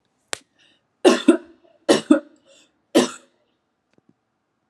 {"three_cough_length": "4.7 s", "three_cough_amplitude": 29253, "three_cough_signal_mean_std_ratio": 0.27, "survey_phase": "alpha (2021-03-01 to 2021-08-12)", "age": "18-44", "gender": "Female", "wearing_mask": "No", "symptom_none": true, "smoker_status": "Never smoked", "respiratory_condition_asthma": false, "respiratory_condition_other": false, "recruitment_source": "REACT", "submission_delay": "1 day", "covid_test_result": "Negative", "covid_test_method": "RT-qPCR"}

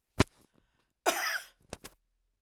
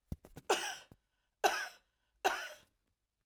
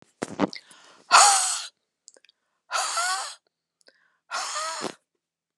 {"cough_length": "2.4 s", "cough_amplitude": 11444, "cough_signal_mean_std_ratio": 0.27, "three_cough_length": "3.3 s", "three_cough_amplitude": 6745, "three_cough_signal_mean_std_ratio": 0.34, "exhalation_length": "5.6 s", "exhalation_amplitude": 27283, "exhalation_signal_mean_std_ratio": 0.37, "survey_phase": "alpha (2021-03-01 to 2021-08-12)", "age": "65+", "gender": "Female", "wearing_mask": "No", "symptom_none": true, "smoker_status": "Ex-smoker", "respiratory_condition_asthma": false, "respiratory_condition_other": false, "recruitment_source": "REACT", "submission_delay": "1 day", "covid_test_result": "Negative", "covid_test_method": "RT-qPCR"}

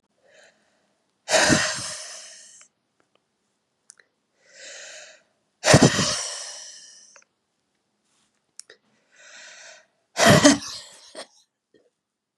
{"exhalation_length": "12.4 s", "exhalation_amplitude": 32622, "exhalation_signal_mean_std_ratio": 0.29, "survey_phase": "beta (2021-08-13 to 2022-03-07)", "age": "45-64", "gender": "Male", "wearing_mask": "No", "symptom_cough_any": true, "symptom_runny_or_blocked_nose": true, "symptom_fatigue": true, "symptom_headache": true, "symptom_other": true, "symptom_onset": "7 days", "smoker_status": "Never smoked", "respiratory_condition_asthma": false, "respiratory_condition_other": false, "recruitment_source": "Test and Trace", "submission_delay": "2 days", "covid_test_result": "Positive", "covid_test_method": "RT-qPCR", "covid_ct_value": 20.3, "covid_ct_gene": "N gene"}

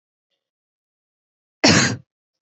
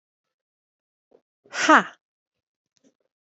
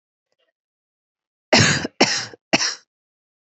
{"cough_length": "2.5 s", "cough_amplitude": 29507, "cough_signal_mean_std_ratio": 0.27, "exhalation_length": "3.3 s", "exhalation_amplitude": 26932, "exhalation_signal_mean_std_ratio": 0.18, "three_cough_length": "3.4 s", "three_cough_amplitude": 28193, "three_cough_signal_mean_std_ratio": 0.34, "survey_phase": "beta (2021-08-13 to 2022-03-07)", "age": "18-44", "gender": "Female", "wearing_mask": "No", "symptom_none": true, "smoker_status": "Never smoked", "respiratory_condition_asthma": false, "respiratory_condition_other": false, "recruitment_source": "REACT", "submission_delay": "1 day", "covid_test_result": "Negative", "covid_test_method": "RT-qPCR", "influenza_a_test_result": "Negative", "influenza_b_test_result": "Negative"}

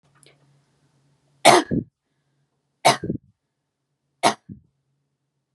{"three_cough_length": "5.5 s", "three_cough_amplitude": 32530, "three_cough_signal_mean_std_ratio": 0.23, "survey_phase": "beta (2021-08-13 to 2022-03-07)", "age": "18-44", "gender": "Female", "wearing_mask": "No", "symptom_none": true, "symptom_onset": "10 days", "smoker_status": "Never smoked", "respiratory_condition_asthma": false, "respiratory_condition_other": false, "recruitment_source": "REACT", "submission_delay": "2 days", "covid_test_result": "Negative", "covid_test_method": "RT-qPCR", "influenza_a_test_result": "Negative", "influenza_b_test_result": "Negative"}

